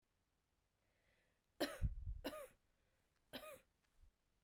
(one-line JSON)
{"three_cough_length": "4.4 s", "three_cough_amplitude": 1207, "three_cough_signal_mean_std_ratio": 0.34, "survey_phase": "beta (2021-08-13 to 2022-03-07)", "age": "18-44", "gender": "Female", "wearing_mask": "No", "symptom_cough_any": true, "symptom_runny_or_blocked_nose": true, "symptom_shortness_of_breath": true, "symptom_sore_throat": true, "symptom_fatigue": true, "symptom_fever_high_temperature": true, "symptom_headache": true, "symptom_other": true, "smoker_status": "Never smoked", "respiratory_condition_asthma": false, "respiratory_condition_other": false, "recruitment_source": "Test and Trace", "submission_delay": "1 day", "covid_test_result": "Positive", "covid_test_method": "RT-qPCR"}